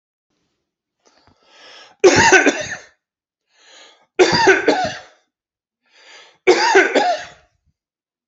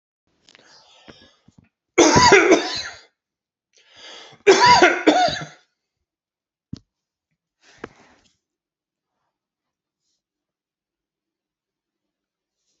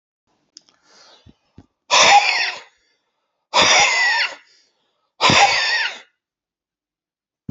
{"three_cough_length": "8.3 s", "three_cough_amplitude": 31594, "three_cough_signal_mean_std_ratio": 0.39, "cough_length": "12.8 s", "cough_amplitude": 32767, "cough_signal_mean_std_ratio": 0.28, "exhalation_length": "7.5 s", "exhalation_amplitude": 31463, "exhalation_signal_mean_std_ratio": 0.43, "survey_phase": "beta (2021-08-13 to 2022-03-07)", "age": "45-64", "gender": "Male", "wearing_mask": "No", "symptom_none": true, "smoker_status": "Ex-smoker", "respiratory_condition_asthma": false, "respiratory_condition_other": false, "recruitment_source": "REACT", "submission_delay": "1 day", "covid_test_result": "Negative", "covid_test_method": "RT-qPCR"}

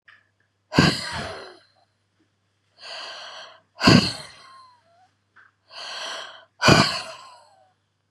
{"exhalation_length": "8.1 s", "exhalation_amplitude": 32767, "exhalation_signal_mean_std_ratio": 0.31, "survey_phase": "beta (2021-08-13 to 2022-03-07)", "age": "45-64", "wearing_mask": "No", "symptom_cough_any": true, "symptom_shortness_of_breath": true, "symptom_sore_throat": true, "symptom_fatigue": true, "symptom_headache": true, "symptom_onset": "8 days", "smoker_status": "Never smoked", "respiratory_condition_asthma": true, "respiratory_condition_other": false, "recruitment_source": "Test and Trace", "submission_delay": "2 days", "covid_test_result": "Negative", "covid_test_method": "RT-qPCR"}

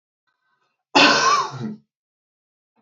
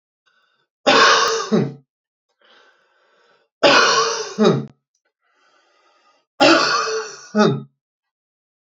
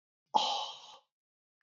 {"cough_length": "2.8 s", "cough_amplitude": 30796, "cough_signal_mean_std_ratio": 0.37, "three_cough_length": "8.6 s", "three_cough_amplitude": 30883, "three_cough_signal_mean_std_ratio": 0.44, "exhalation_length": "1.6 s", "exhalation_amplitude": 7519, "exhalation_signal_mean_std_ratio": 0.36, "survey_phase": "beta (2021-08-13 to 2022-03-07)", "age": "18-44", "gender": "Male", "wearing_mask": "No", "symptom_runny_or_blocked_nose": true, "symptom_onset": "13 days", "smoker_status": "Never smoked", "respiratory_condition_asthma": false, "respiratory_condition_other": false, "recruitment_source": "REACT", "submission_delay": "0 days", "covid_test_result": "Negative", "covid_test_method": "RT-qPCR", "influenza_a_test_result": "Negative", "influenza_b_test_result": "Negative"}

